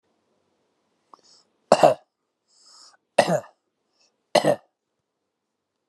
{
  "cough_length": "5.9 s",
  "cough_amplitude": 31784,
  "cough_signal_mean_std_ratio": 0.22,
  "survey_phase": "alpha (2021-03-01 to 2021-08-12)",
  "age": "45-64",
  "gender": "Male",
  "wearing_mask": "No",
  "symptom_none": true,
  "smoker_status": "Ex-smoker",
  "respiratory_condition_asthma": false,
  "respiratory_condition_other": false,
  "recruitment_source": "REACT",
  "submission_delay": "4 days",
  "covid_test_result": "Negative",
  "covid_test_method": "RT-qPCR"
}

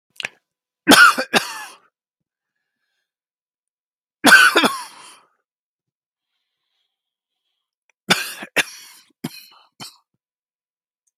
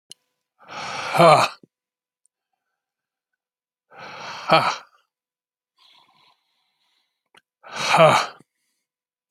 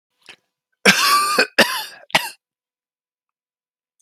{
  "three_cough_length": "11.2 s",
  "three_cough_amplitude": 32768,
  "three_cough_signal_mean_std_ratio": 0.25,
  "exhalation_length": "9.3 s",
  "exhalation_amplitude": 28254,
  "exhalation_signal_mean_std_ratio": 0.28,
  "cough_length": "4.0 s",
  "cough_amplitude": 32768,
  "cough_signal_mean_std_ratio": 0.37,
  "survey_phase": "alpha (2021-03-01 to 2021-08-12)",
  "age": "65+",
  "gender": "Male",
  "wearing_mask": "No",
  "symptom_new_continuous_cough": true,
  "symptom_fatigue": true,
  "smoker_status": "Ex-smoker",
  "respiratory_condition_asthma": false,
  "respiratory_condition_other": false,
  "recruitment_source": "REACT",
  "submission_delay": "2 days",
  "covid_test_result": "Negative",
  "covid_test_method": "RT-qPCR"
}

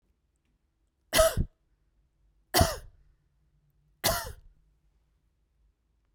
{
  "three_cough_length": "6.1 s",
  "three_cough_amplitude": 13677,
  "three_cough_signal_mean_std_ratio": 0.26,
  "survey_phase": "beta (2021-08-13 to 2022-03-07)",
  "age": "18-44",
  "gender": "Female",
  "wearing_mask": "No",
  "symptom_runny_or_blocked_nose": true,
  "smoker_status": "Never smoked",
  "respiratory_condition_asthma": false,
  "respiratory_condition_other": false,
  "recruitment_source": "Test and Trace",
  "submission_delay": "1 day",
  "covid_test_result": "Positive",
  "covid_test_method": "RT-qPCR",
  "covid_ct_value": 18.0,
  "covid_ct_gene": "ORF1ab gene",
  "covid_ct_mean": 18.5,
  "covid_viral_load": "830000 copies/ml",
  "covid_viral_load_category": "Low viral load (10K-1M copies/ml)"
}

